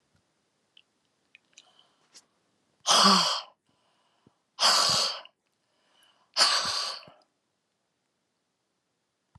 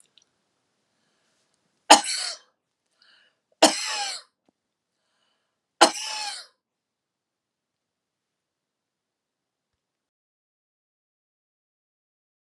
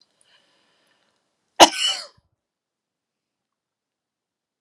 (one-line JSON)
{"exhalation_length": "9.4 s", "exhalation_amplitude": 14664, "exhalation_signal_mean_std_ratio": 0.33, "three_cough_length": "12.5 s", "three_cough_amplitude": 32767, "three_cough_signal_mean_std_ratio": 0.17, "cough_length": "4.6 s", "cough_amplitude": 32768, "cough_signal_mean_std_ratio": 0.15, "survey_phase": "beta (2021-08-13 to 2022-03-07)", "age": "65+", "gender": "Female", "wearing_mask": "No", "symptom_none": true, "smoker_status": "Ex-smoker", "respiratory_condition_asthma": false, "respiratory_condition_other": true, "recruitment_source": "REACT", "submission_delay": "3 days", "covid_test_result": "Negative", "covid_test_method": "RT-qPCR"}